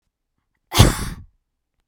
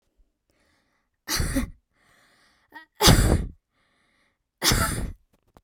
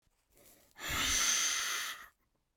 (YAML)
cough_length: 1.9 s
cough_amplitude: 32768
cough_signal_mean_std_ratio: 0.28
three_cough_length: 5.6 s
three_cough_amplitude: 27664
three_cough_signal_mean_std_ratio: 0.36
exhalation_length: 2.6 s
exhalation_amplitude: 3768
exhalation_signal_mean_std_ratio: 0.61
survey_phase: beta (2021-08-13 to 2022-03-07)
age: 18-44
gender: Female
wearing_mask: 'No'
symptom_none: true
smoker_status: Never smoked
respiratory_condition_asthma: false
respiratory_condition_other: false
recruitment_source: REACT
submission_delay: 1 day
covid_test_result: Negative
covid_test_method: RT-qPCR